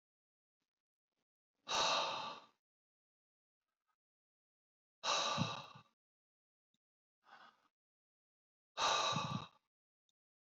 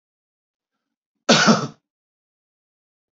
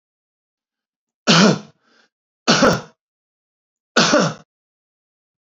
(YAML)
exhalation_length: 10.6 s
exhalation_amplitude: 2527
exhalation_signal_mean_std_ratio: 0.34
cough_length: 3.2 s
cough_amplitude: 29511
cough_signal_mean_std_ratio: 0.26
three_cough_length: 5.5 s
three_cough_amplitude: 30360
three_cough_signal_mean_std_ratio: 0.34
survey_phase: beta (2021-08-13 to 2022-03-07)
age: 45-64
gender: Male
wearing_mask: 'No'
symptom_none: true
smoker_status: Never smoked
respiratory_condition_asthma: false
respiratory_condition_other: false
recruitment_source: REACT
submission_delay: 0 days
covid_test_result: Negative
covid_test_method: RT-qPCR